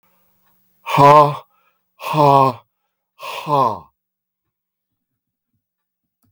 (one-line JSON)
{"exhalation_length": "6.3 s", "exhalation_amplitude": 32766, "exhalation_signal_mean_std_ratio": 0.34, "survey_phase": "beta (2021-08-13 to 2022-03-07)", "age": "65+", "gender": "Male", "wearing_mask": "No", "symptom_cough_any": true, "symptom_runny_or_blocked_nose": true, "symptom_sore_throat": true, "symptom_onset": "8 days", "smoker_status": "Never smoked", "respiratory_condition_asthma": false, "respiratory_condition_other": false, "recruitment_source": "REACT", "submission_delay": "1 day", "covid_test_result": "Positive", "covid_test_method": "RT-qPCR", "covid_ct_value": 19.8, "covid_ct_gene": "E gene", "influenza_a_test_result": "Negative", "influenza_b_test_result": "Negative"}